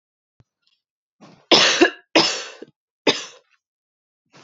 {"three_cough_length": "4.4 s", "three_cough_amplitude": 29914, "three_cough_signal_mean_std_ratio": 0.31, "survey_phase": "beta (2021-08-13 to 2022-03-07)", "age": "18-44", "gender": "Female", "wearing_mask": "No", "symptom_cough_any": true, "symptom_runny_or_blocked_nose": true, "smoker_status": "Never smoked", "respiratory_condition_asthma": true, "respiratory_condition_other": false, "recruitment_source": "REACT", "submission_delay": "1 day", "covid_test_result": "Negative", "covid_test_method": "RT-qPCR"}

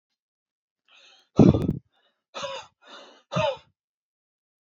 {"exhalation_length": "4.6 s", "exhalation_amplitude": 27081, "exhalation_signal_mean_std_ratio": 0.25, "survey_phase": "alpha (2021-03-01 to 2021-08-12)", "age": "18-44", "gender": "Male", "wearing_mask": "No", "symptom_none": true, "smoker_status": "Never smoked", "respiratory_condition_asthma": false, "respiratory_condition_other": false, "recruitment_source": "REACT", "submission_delay": "1 day", "covid_test_result": "Negative", "covid_test_method": "RT-qPCR"}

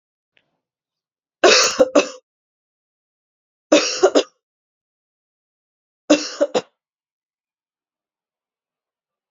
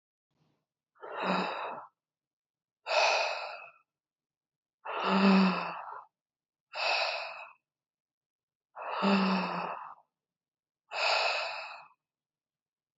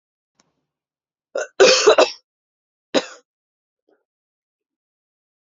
{"three_cough_length": "9.3 s", "three_cough_amplitude": 32768, "three_cough_signal_mean_std_ratio": 0.26, "exhalation_length": "13.0 s", "exhalation_amplitude": 7217, "exhalation_signal_mean_std_ratio": 0.47, "cough_length": "5.5 s", "cough_amplitude": 28596, "cough_signal_mean_std_ratio": 0.25, "survey_phase": "alpha (2021-03-01 to 2021-08-12)", "age": "18-44", "gender": "Female", "wearing_mask": "No", "symptom_cough_any": true, "symptom_fever_high_temperature": true, "smoker_status": "Never smoked", "respiratory_condition_asthma": false, "respiratory_condition_other": false, "recruitment_source": "Test and Trace", "submission_delay": "1 day", "covid_test_result": "Positive", "covid_test_method": "LFT"}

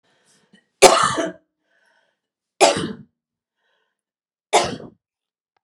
{"three_cough_length": "5.6 s", "three_cough_amplitude": 32768, "three_cough_signal_mean_std_ratio": 0.28, "survey_phase": "beta (2021-08-13 to 2022-03-07)", "age": "45-64", "gender": "Female", "wearing_mask": "No", "symptom_none": true, "smoker_status": "Never smoked", "respiratory_condition_asthma": false, "respiratory_condition_other": false, "recruitment_source": "REACT", "submission_delay": "2 days", "covid_test_result": "Negative", "covid_test_method": "RT-qPCR"}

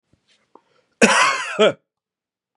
{"cough_length": "2.6 s", "cough_amplitude": 32767, "cough_signal_mean_std_ratio": 0.38, "survey_phase": "beta (2021-08-13 to 2022-03-07)", "age": "18-44", "gender": "Male", "wearing_mask": "No", "symptom_none": true, "smoker_status": "Ex-smoker", "respiratory_condition_asthma": false, "respiratory_condition_other": false, "recruitment_source": "REACT", "submission_delay": "4 days", "covid_test_result": "Negative", "covid_test_method": "RT-qPCR", "influenza_a_test_result": "Negative", "influenza_b_test_result": "Negative"}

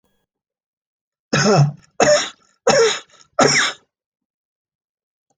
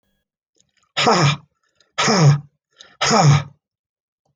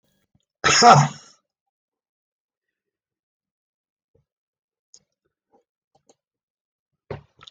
{"three_cough_length": "5.4 s", "three_cough_amplitude": 29102, "three_cough_signal_mean_std_ratio": 0.41, "exhalation_length": "4.4 s", "exhalation_amplitude": 30553, "exhalation_signal_mean_std_ratio": 0.45, "cough_length": "7.5 s", "cough_amplitude": 29521, "cough_signal_mean_std_ratio": 0.19, "survey_phase": "beta (2021-08-13 to 2022-03-07)", "age": "65+", "gender": "Male", "wearing_mask": "No", "symptom_none": true, "smoker_status": "Ex-smoker", "respiratory_condition_asthma": false, "respiratory_condition_other": true, "recruitment_source": "REACT", "submission_delay": "2 days", "covid_test_result": "Negative", "covid_test_method": "RT-qPCR"}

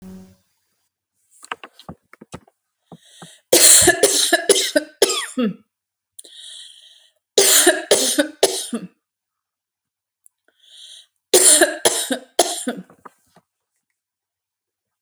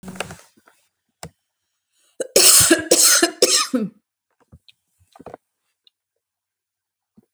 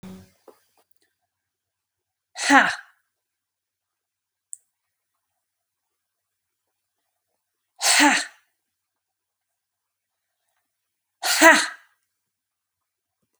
{"three_cough_length": "15.0 s", "three_cough_amplitude": 32768, "three_cough_signal_mean_std_ratio": 0.36, "cough_length": "7.3 s", "cough_amplitude": 32768, "cough_signal_mean_std_ratio": 0.33, "exhalation_length": "13.4 s", "exhalation_amplitude": 28810, "exhalation_signal_mean_std_ratio": 0.22, "survey_phase": "alpha (2021-03-01 to 2021-08-12)", "age": "45-64", "gender": "Female", "wearing_mask": "No", "symptom_none": true, "smoker_status": "Never smoked", "respiratory_condition_asthma": false, "respiratory_condition_other": false, "recruitment_source": "REACT", "submission_delay": "6 days", "covid_test_result": "Negative", "covid_test_method": "RT-qPCR"}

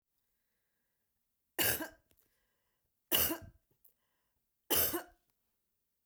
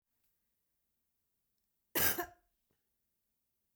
{"three_cough_length": "6.1 s", "three_cough_amplitude": 5862, "three_cough_signal_mean_std_ratio": 0.29, "cough_length": "3.8 s", "cough_amplitude": 4931, "cough_signal_mean_std_ratio": 0.21, "survey_phase": "beta (2021-08-13 to 2022-03-07)", "age": "45-64", "gender": "Female", "wearing_mask": "No", "symptom_cough_any": true, "symptom_sore_throat": true, "smoker_status": "Never smoked", "respiratory_condition_asthma": false, "respiratory_condition_other": false, "recruitment_source": "REACT", "submission_delay": "2 days", "covid_test_result": "Negative", "covid_test_method": "RT-qPCR", "influenza_a_test_result": "Unknown/Void", "influenza_b_test_result": "Unknown/Void"}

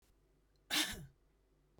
{"cough_length": "1.8 s", "cough_amplitude": 2631, "cough_signal_mean_std_ratio": 0.33, "survey_phase": "beta (2021-08-13 to 2022-03-07)", "age": "45-64", "gender": "Female", "wearing_mask": "No", "symptom_none": true, "smoker_status": "Never smoked", "respiratory_condition_asthma": false, "respiratory_condition_other": false, "recruitment_source": "REACT", "submission_delay": "3 days", "covid_test_result": "Negative", "covid_test_method": "RT-qPCR", "influenza_a_test_result": "Negative", "influenza_b_test_result": "Negative"}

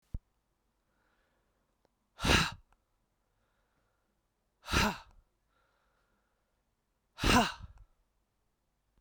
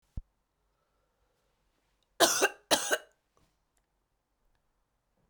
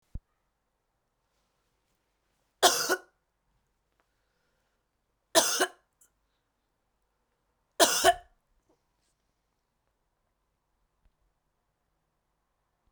{"exhalation_length": "9.0 s", "exhalation_amplitude": 7370, "exhalation_signal_mean_std_ratio": 0.25, "cough_length": "5.3 s", "cough_amplitude": 13979, "cough_signal_mean_std_ratio": 0.23, "three_cough_length": "12.9 s", "three_cough_amplitude": 17915, "three_cough_signal_mean_std_ratio": 0.2, "survey_phase": "beta (2021-08-13 to 2022-03-07)", "age": "45-64", "gender": "Female", "wearing_mask": "No", "symptom_cough_any": true, "symptom_new_continuous_cough": true, "symptom_runny_or_blocked_nose": true, "symptom_shortness_of_breath": true, "symptom_sore_throat": true, "symptom_fatigue": true, "symptom_headache": true, "symptom_change_to_sense_of_smell_or_taste": true, "symptom_loss_of_taste": true, "symptom_onset": "5 days", "smoker_status": "Prefer not to say", "respiratory_condition_asthma": false, "respiratory_condition_other": false, "recruitment_source": "Test and Trace", "submission_delay": "2 days", "covid_test_result": "Positive", "covid_test_method": "RT-qPCR", "covid_ct_value": 23.1, "covid_ct_gene": "ORF1ab gene"}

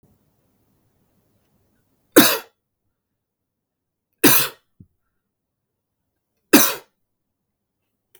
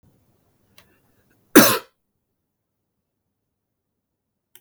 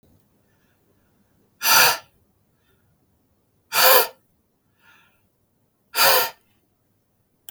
{"three_cough_length": "8.2 s", "three_cough_amplitude": 32768, "three_cough_signal_mean_std_ratio": 0.21, "cough_length": "4.6 s", "cough_amplitude": 32768, "cough_signal_mean_std_ratio": 0.16, "exhalation_length": "7.5 s", "exhalation_amplitude": 31514, "exhalation_signal_mean_std_ratio": 0.29, "survey_phase": "beta (2021-08-13 to 2022-03-07)", "age": "18-44", "gender": "Male", "wearing_mask": "No", "symptom_none": true, "smoker_status": "Never smoked", "respiratory_condition_asthma": false, "respiratory_condition_other": false, "recruitment_source": "REACT", "submission_delay": "3 days", "covid_test_result": "Negative", "covid_test_method": "RT-qPCR", "influenza_a_test_result": "Negative", "influenza_b_test_result": "Negative"}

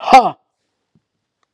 {"exhalation_length": "1.5 s", "exhalation_amplitude": 32768, "exhalation_signal_mean_std_ratio": 0.29, "survey_phase": "alpha (2021-03-01 to 2021-08-12)", "age": "45-64", "gender": "Female", "wearing_mask": "No", "symptom_cough_any": true, "symptom_shortness_of_breath": true, "symptom_fatigue": true, "symptom_headache": true, "symptom_onset": "4 days", "smoker_status": "Prefer not to say", "respiratory_condition_asthma": false, "respiratory_condition_other": false, "recruitment_source": "Test and Trace", "submission_delay": "2 days", "covid_test_result": "Positive", "covid_test_method": "RT-qPCR", "covid_ct_value": 15.5, "covid_ct_gene": "ORF1ab gene", "covid_ct_mean": 15.5, "covid_viral_load": "8200000 copies/ml", "covid_viral_load_category": "High viral load (>1M copies/ml)"}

